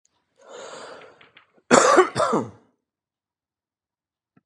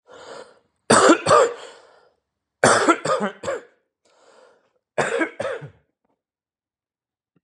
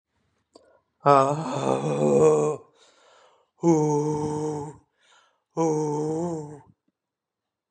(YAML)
cough_length: 4.5 s
cough_amplitude: 32025
cough_signal_mean_std_ratio: 0.3
three_cough_length: 7.4 s
three_cough_amplitude: 31362
three_cough_signal_mean_std_ratio: 0.36
exhalation_length: 7.7 s
exhalation_amplitude: 21086
exhalation_signal_mean_std_ratio: 0.52
survey_phase: beta (2021-08-13 to 2022-03-07)
age: 45-64
gender: Male
wearing_mask: 'No'
symptom_cough_any: true
symptom_onset: 10 days
smoker_status: Current smoker (11 or more cigarettes per day)
respiratory_condition_asthma: true
respiratory_condition_other: false
recruitment_source: REACT
submission_delay: 1 day
covid_test_result: Negative
covid_test_method: RT-qPCR
influenza_a_test_result: Negative
influenza_b_test_result: Negative